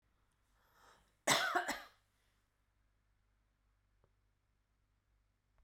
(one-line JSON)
{"cough_length": "5.6 s", "cough_amplitude": 4695, "cough_signal_mean_std_ratio": 0.24, "survey_phase": "beta (2021-08-13 to 2022-03-07)", "age": "45-64", "gender": "Female", "wearing_mask": "No", "symptom_new_continuous_cough": true, "symptom_abdominal_pain": true, "symptom_fatigue": true, "symptom_headache": true, "symptom_onset": "3 days", "smoker_status": "Never smoked", "respiratory_condition_asthma": false, "respiratory_condition_other": false, "recruitment_source": "Test and Trace", "submission_delay": "2 days", "covid_test_result": "Positive", "covid_test_method": "RT-qPCR", "covid_ct_value": 15.7, "covid_ct_gene": "S gene", "covid_ct_mean": 16.1, "covid_viral_load": "5300000 copies/ml", "covid_viral_load_category": "High viral load (>1M copies/ml)"}